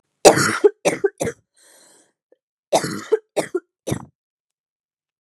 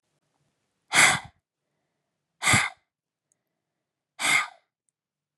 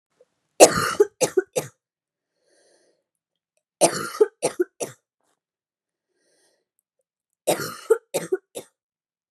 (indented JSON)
{
  "cough_length": "5.2 s",
  "cough_amplitude": 32768,
  "cough_signal_mean_std_ratio": 0.31,
  "exhalation_length": "5.4 s",
  "exhalation_amplitude": 18874,
  "exhalation_signal_mean_std_ratio": 0.29,
  "three_cough_length": "9.3 s",
  "three_cough_amplitude": 32768,
  "three_cough_signal_mean_std_ratio": 0.25,
  "survey_phase": "beta (2021-08-13 to 2022-03-07)",
  "age": "18-44",
  "gender": "Female",
  "wearing_mask": "No",
  "symptom_cough_any": true,
  "symptom_shortness_of_breath": true,
  "symptom_sore_throat": true,
  "symptom_fatigue": true,
  "symptom_headache": true,
  "smoker_status": "Ex-smoker",
  "respiratory_condition_asthma": false,
  "respiratory_condition_other": false,
  "recruitment_source": "Test and Trace",
  "submission_delay": "2 days",
  "covid_test_result": "Positive",
  "covid_test_method": "RT-qPCR",
  "covid_ct_value": 33.8,
  "covid_ct_gene": "ORF1ab gene"
}